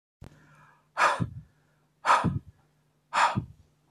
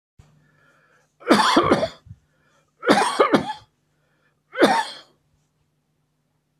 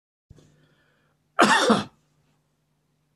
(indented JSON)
{
  "exhalation_length": "3.9 s",
  "exhalation_amplitude": 11738,
  "exhalation_signal_mean_std_ratio": 0.39,
  "three_cough_length": "6.6 s",
  "three_cough_amplitude": 28711,
  "three_cough_signal_mean_std_ratio": 0.37,
  "cough_length": "3.2 s",
  "cough_amplitude": 24072,
  "cough_signal_mean_std_ratio": 0.29,
  "survey_phase": "alpha (2021-03-01 to 2021-08-12)",
  "age": "65+",
  "gender": "Male",
  "wearing_mask": "No",
  "symptom_none": true,
  "smoker_status": "Never smoked",
  "respiratory_condition_asthma": false,
  "respiratory_condition_other": false,
  "recruitment_source": "REACT",
  "submission_delay": "1 day",
  "covid_test_result": "Negative",
  "covid_test_method": "RT-qPCR"
}